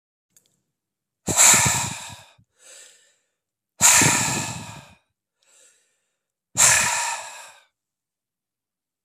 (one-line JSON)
{"exhalation_length": "9.0 s", "exhalation_amplitude": 32596, "exhalation_signal_mean_std_ratio": 0.36, "survey_phase": "beta (2021-08-13 to 2022-03-07)", "age": "18-44", "gender": "Male", "wearing_mask": "No", "symptom_cough_any": true, "symptom_runny_or_blocked_nose": true, "symptom_change_to_sense_of_smell_or_taste": true, "smoker_status": "Current smoker (1 to 10 cigarettes per day)", "respiratory_condition_asthma": false, "respiratory_condition_other": false, "recruitment_source": "Test and Trace", "submission_delay": "2 days", "covid_test_result": "Positive", "covid_test_method": "RT-qPCR", "covid_ct_value": 30.0, "covid_ct_gene": "N gene"}